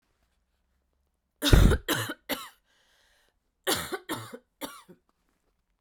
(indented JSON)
{
  "cough_length": "5.8 s",
  "cough_amplitude": 22277,
  "cough_signal_mean_std_ratio": 0.28,
  "survey_phase": "beta (2021-08-13 to 2022-03-07)",
  "age": "18-44",
  "gender": "Female",
  "wearing_mask": "No",
  "symptom_cough_any": true,
  "symptom_new_continuous_cough": true,
  "symptom_runny_or_blocked_nose": true,
  "symptom_shortness_of_breath": true,
  "symptom_sore_throat": true,
  "symptom_fatigue": true,
  "symptom_headache": true,
  "symptom_change_to_sense_of_smell_or_taste": true,
  "smoker_status": "Never smoked",
  "respiratory_condition_asthma": true,
  "respiratory_condition_other": false,
  "recruitment_source": "Test and Trace",
  "submission_delay": "2 days",
  "covid_test_result": "Positive",
  "covid_test_method": "RT-qPCR",
  "covid_ct_value": 21.6,
  "covid_ct_gene": "ORF1ab gene",
  "covid_ct_mean": 22.1,
  "covid_viral_load": "56000 copies/ml",
  "covid_viral_load_category": "Low viral load (10K-1M copies/ml)"
}